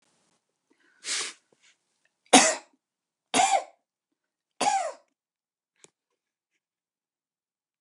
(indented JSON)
{
  "three_cough_length": "7.8 s",
  "three_cough_amplitude": 28795,
  "three_cough_signal_mean_std_ratio": 0.25,
  "survey_phase": "beta (2021-08-13 to 2022-03-07)",
  "age": "65+",
  "gender": "Female",
  "wearing_mask": "No",
  "symptom_none": true,
  "smoker_status": "Ex-smoker",
  "respiratory_condition_asthma": false,
  "respiratory_condition_other": false,
  "recruitment_source": "REACT",
  "submission_delay": "2 days",
  "covid_test_result": "Negative",
  "covid_test_method": "RT-qPCR"
}